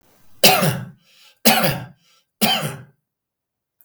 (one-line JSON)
{"three_cough_length": "3.8 s", "three_cough_amplitude": 32768, "three_cough_signal_mean_std_ratio": 0.4, "survey_phase": "beta (2021-08-13 to 2022-03-07)", "age": "65+", "gender": "Male", "wearing_mask": "No", "symptom_none": true, "smoker_status": "Ex-smoker", "respiratory_condition_asthma": false, "respiratory_condition_other": false, "recruitment_source": "REACT", "submission_delay": "4 days", "covid_test_result": "Negative", "covid_test_method": "RT-qPCR", "influenza_a_test_result": "Negative", "influenza_b_test_result": "Negative"}